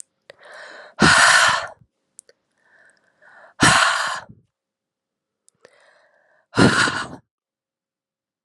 exhalation_length: 8.4 s
exhalation_amplitude: 30579
exhalation_signal_mean_std_ratio: 0.36
survey_phase: beta (2021-08-13 to 2022-03-07)
age: 18-44
gender: Female
wearing_mask: 'No'
symptom_cough_any: true
symptom_new_continuous_cough: true
symptom_runny_or_blocked_nose: true
symptom_shortness_of_breath: true
symptom_fatigue: true
symptom_headache: true
symptom_change_to_sense_of_smell_or_taste: true
symptom_onset: 5 days
smoker_status: Never smoked
respiratory_condition_asthma: false
respiratory_condition_other: false
recruitment_source: Test and Trace
submission_delay: 1 day
covid_test_result: Positive
covid_test_method: RT-qPCR
covid_ct_value: 19.8
covid_ct_gene: ORF1ab gene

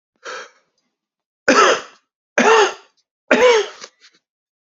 three_cough_length: 4.8 s
three_cough_amplitude: 30907
three_cough_signal_mean_std_ratio: 0.39
survey_phase: beta (2021-08-13 to 2022-03-07)
age: 45-64
gender: Male
wearing_mask: 'No'
symptom_none: true
smoker_status: Never smoked
respiratory_condition_asthma: false
respiratory_condition_other: false
recruitment_source: REACT
submission_delay: 2 days
covid_test_result: Negative
covid_test_method: RT-qPCR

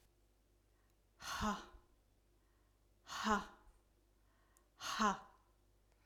exhalation_length: 6.1 s
exhalation_amplitude: 2510
exhalation_signal_mean_std_ratio: 0.34
survey_phase: alpha (2021-03-01 to 2021-08-12)
age: 45-64
gender: Female
wearing_mask: 'No'
symptom_none: true
smoker_status: Never smoked
respiratory_condition_asthma: false
respiratory_condition_other: false
recruitment_source: REACT
submission_delay: 2 days
covid_test_result: Negative
covid_test_method: RT-qPCR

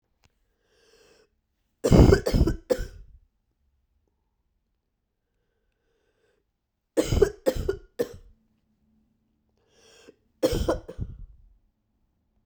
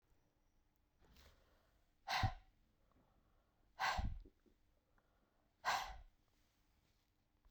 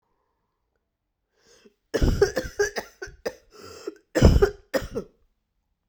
three_cough_length: 12.5 s
three_cough_amplitude: 23119
three_cough_signal_mean_std_ratio: 0.27
exhalation_length: 7.5 s
exhalation_amplitude: 1537
exhalation_signal_mean_std_ratio: 0.31
cough_length: 5.9 s
cough_amplitude: 26709
cough_signal_mean_std_ratio: 0.33
survey_phase: beta (2021-08-13 to 2022-03-07)
age: 45-64
gender: Female
wearing_mask: 'No'
symptom_cough_any: true
symptom_runny_or_blocked_nose: true
symptom_headache: true
symptom_onset: 2 days
smoker_status: Ex-smoker
respiratory_condition_asthma: false
respiratory_condition_other: false
recruitment_source: Test and Trace
submission_delay: 1 day
covid_test_result: Positive
covid_test_method: RT-qPCR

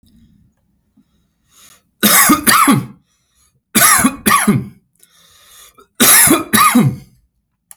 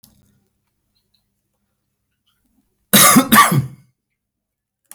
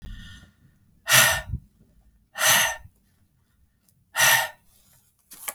three_cough_length: 7.8 s
three_cough_amplitude: 32768
three_cough_signal_mean_std_ratio: 0.48
cough_length: 4.9 s
cough_amplitude: 32768
cough_signal_mean_std_ratio: 0.29
exhalation_length: 5.5 s
exhalation_amplitude: 26271
exhalation_signal_mean_std_ratio: 0.37
survey_phase: alpha (2021-03-01 to 2021-08-12)
age: 18-44
gender: Male
wearing_mask: 'No'
symptom_new_continuous_cough: true
symptom_fatigue: true
smoker_status: Ex-smoker
respiratory_condition_asthma: false
respiratory_condition_other: false
recruitment_source: Test and Trace
submission_delay: 2 days
covid_test_result: Positive
covid_test_method: RT-qPCR
covid_ct_value: 15.2
covid_ct_gene: ORF1ab gene
covid_ct_mean: 15.6
covid_viral_load: 7600000 copies/ml
covid_viral_load_category: High viral load (>1M copies/ml)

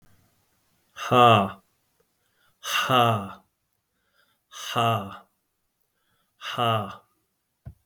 exhalation_length: 7.9 s
exhalation_amplitude: 20471
exhalation_signal_mean_std_ratio: 0.36
survey_phase: beta (2021-08-13 to 2022-03-07)
age: 45-64
gender: Male
wearing_mask: 'No'
symptom_none: true
smoker_status: Ex-smoker
respiratory_condition_asthma: true
respiratory_condition_other: false
recruitment_source: REACT
submission_delay: 13 days
covid_test_result: Negative
covid_test_method: RT-qPCR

